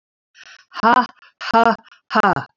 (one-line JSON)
{"exhalation_length": "2.6 s", "exhalation_amplitude": 26769, "exhalation_signal_mean_std_ratio": 0.41, "survey_phase": "beta (2021-08-13 to 2022-03-07)", "age": "65+", "gender": "Female", "wearing_mask": "No", "symptom_none": true, "smoker_status": "Never smoked", "respiratory_condition_asthma": false, "respiratory_condition_other": false, "recruitment_source": "REACT", "submission_delay": "1 day", "covid_test_result": "Negative", "covid_test_method": "RT-qPCR", "influenza_a_test_result": "Unknown/Void", "influenza_b_test_result": "Unknown/Void"}